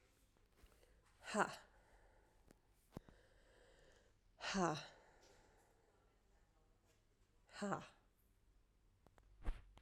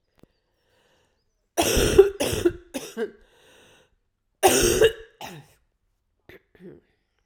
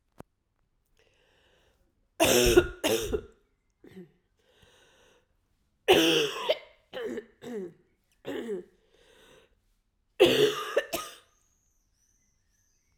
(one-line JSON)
{"exhalation_length": "9.8 s", "exhalation_amplitude": 2214, "exhalation_signal_mean_std_ratio": 0.3, "cough_length": "7.3 s", "cough_amplitude": 30116, "cough_signal_mean_std_ratio": 0.34, "three_cough_length": "13.0 s", "three_cough_amplitude": 18158, "three_cough_signal_mean_std_ratio": 0.34, "survey_phase": "alpha (2021-03-01 to 2021-08-12)", "age": "45-64", "gender": "Female", "wearing_mask": "No", "symptom_cough_any": true, "symptom_new_continuous_cough": true, "symptom_shortness_of_breath": true, "symptom_diarrhoea": true, "symptom_fatigue": true, "symptom_fever_high_temperature": true, "symptom_headache": true, "symptom_change_to_sense_of_smell_or_taste": true, "symptom_loss_of_taste": true, "smoker_status": "Never smoked", "respiratory_condition_asthma": false, "respiratory_condition_other": false, "recruitment_source": "Test and Trace", "submission_delay": "1 day", "covid_test_result": "Positive", "covid_test_method": "RT-qPCR", "covid_ct_value": 15.1, "covid_ct_gene": "ORF1ab gene", "covid_ct_mean": 15.3, "covid_viral_load": "9900000 copies/ml", "covid_viral_load_category": "High viral load (>1M copies/ml)"}